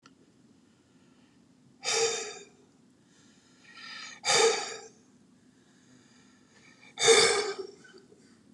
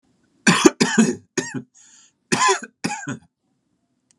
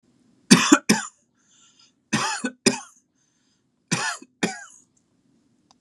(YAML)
exhalation_length: 8.5 s
exhalation_amplitude: 13427
exhalation_signal_mean_std_ratio: 0.34
cough_length: 4.2 s
cough_amplitude: 32768
cough_signal_mean_std_ratio: 0.38
three_cough_length: 5.8 s
three_cough_amplitude: 32767
three_cough_signal_mean_std_ratio: 0.29
survey_phase: beta (2021-08-13 to 2022-03-07)
age: 45-64
gender: Male
wearing_mask: 'No'
symptom_none: true
smoker_status: Never smoked
respiratory_condition_asthma: false
respiratory_condition_other: false
recruitment_source: REACT
submission_delay: 1 day
covid_test_result: Negative
covid_test_method: RT-qPCR